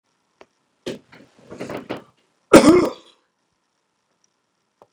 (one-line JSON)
{"cough_length": "4.9 s", "cough_amplitude": 32768, "cough_signal_mean_std_ratio": 0.23, "survey_phase": "beta (2021-08-13 to 2022-03-07)", "age": "65+", "gender": "Male", "wearing_mask": "No", "symptom_none": true, "smoker_status": "Ex-smoker", "respiratory_condition_asthma": false, "respiratory_condition_other": false, "recruitment_source": "REACT", "submission_delay": "1 day", "covid_test_result": "Negative", "covid_test_method": "RT-qPCR", "influenza_a_test_result": "Negative", "influenza_b_test_result": "Negative"}